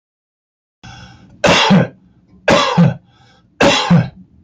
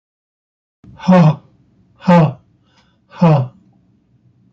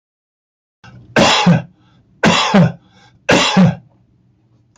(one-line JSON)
{"cough_length": "4.4 s", "cough_amplitude": 29965, "cough_signal_mean_std_ratio": 0.48, "exhalation_length": "4.5 s", "exhalation_amplitude": 27819, "exhalation_signal_mean_std_ratio": 0.36, "three_cough_length": "4.8 s", "three_cough_amplitude": 29063, "three_cough_signal_mean_std_ratio": 0.45, "survey_phase": "beta (2021-08-13 to 2022-03-07)", "age": "65+", "gender": "Male", "wearing_mask": "No", "symptom_cough_any": true, "symptom_runny_or_blocked_nose": true, "symptom_onset": "13 days", "smoker_status": "Never smoked", "respiratory_condition_asthma": false, "respiratory_condition_other": false, "recruitment_source": "REACT", "submission_delay": "3 days", "covid_test_result": "Negative", "covid_test_method": "RT-qPCR", "influenza_a_test_result": "Negative", "influenza_b_test_result": "Negative"}